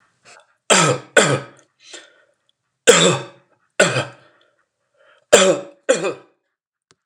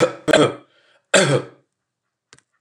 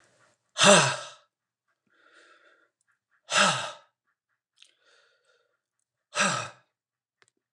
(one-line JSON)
{"three_cough_length": "7.1 s", "three_cough_amplitude": 29204, "three_cough_signal_mean_std_ratio": 0.36, "cough_length": "2.6 s", "cough_amplitude": 29204, "cough_signal_mean_std_ratio": 0.39, "exhalation_length": "7.5 s", "exhalation_amplitude": 21896, "exhalation_signal_mean_std_ratio": 0.27, "survey_phase": "alpha (2021-03-01 to 2021-08-12)", "age": "65+", "gender": "Male", "wearing_mask": "No", "symptom_none": true, "smoker_status": "Ex-smoker", "respiratory_condition_asthma": false, "respiratory_condition_other": false, "recruitment_source": "REACT", "submission_delay": "2 days", "covid_test_result": "Negative", "covid_test_method": "RT-qPCR"}